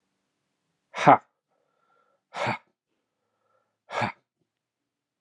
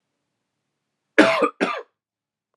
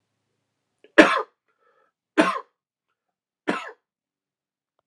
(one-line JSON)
{"exhalation_length": "5.2 s", "exhalation_amplitude": 29360, "exhalation_signal_mean_std_ratio": 0.19, "cough_length": "2.6 s", "cough_amplitude": 32767, "cough_signal_mean_std_ratio": 0.3, "three_cough_length": "4.9 s", "three_cough_amplitude": 32767, "three_cough_signal_mean_std_ratio": 0.21, "survey_phase": "alpha (2021-03-01 to 2021-08-12)", "age": "18-44", "gender": "Male", "wearing_mask": "No", "symptom_cough_any": true, "symptom_fatigue": true, "symptom_headache": true, "symptom_change_to_sense_of_smell_or_taste": true, "symptom_loss_of_taste": true, "smoker_status": "Never smoked", "respiratory_condition_asthma": false, "respiratory_condition_other": false, "recruitment_source": "Test and Trace", "submission_delay": "1 day", "covid_test_result": "Positive", "covid_test_method": "LFT"}